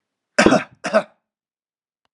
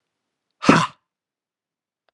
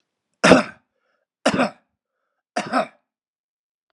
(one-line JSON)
{"cough_length": "2.1 s", "cough_amplitude": 32768, "cough_signal_mean_std_ratio": 0.31, "exhalation_length": "2.1 s", "exhalation_amplitude": 32742, "exhalation_signal_mean_std_ratio": 0.23, "three_cough_length": "3.9 s", "three_cough_amplitude": 32768, "three_cough_signal_mean_std_ratio": 0.28, "survey_phase": "beta (2021-08-13 to 2022-03-07)", "age": "45-64", "gender": "Male", "wearing_mask": "No", "symptom_none": true, "smoker_status": "Never smoked", "respiratory_condition_asthma": false, "respiratory_condition_other": false, "recruitment_source": "REACT", "submission_delay": "2 days", "covid_test_result": "Negative", "covid_test_method": "RT-qPCR", "influenza_a_test_result": "Negative", "influenza_b_test_result": "Negative"}